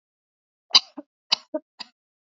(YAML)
three_cough_length: 2.4 s
three_cough_amplitude: 27891
three_cough_signal_mean_std_ratio: 0.16
survey_phase: alpha (2021-03-01 to 2021-08-12)
age: 45-64
gender: Female
wearing_mask: 'No'
symptom_none: true
symptom_onset: 3 days
smoker_status: Never smoked
respiratory_condition_asthma: false
respiratory_condition_other: false
recruitment_source: REACT
submission_delay: 3 days
covid_test_result: Negative
covid_test_method: RT-qPCR